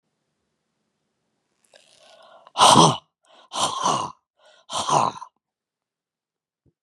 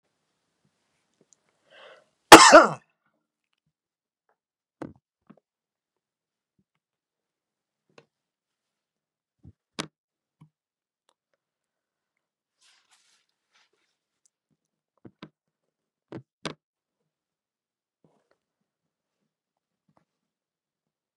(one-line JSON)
{"exhalation_length": "6.8 s", "exhalation_amplitude": 31387, "exhalation_signal_mean_std_ratio": 0.3, "cough_length": "21.2 s", "cough_amplitude": 32768, "cough_signal_mean_std_ratio": 0.1, "survey_phase": "beta (2021-08-13 to 2022-03-07)", "age": "65+", "gender": "Male", "wearing_mask": "No", "symptom_none": true, "smoker_status": "Never smoked", "respiratory_condition_asthma": false, "respiratory_condition_other": false, "recruitment_source": "REACT", "submission_delay": "2 days", "covid_test_result": "Negative", "covid_test_method": "RT-qPCR", "influenza_a_test_result": "Negative", "influenza_b_test_result": "Negative"}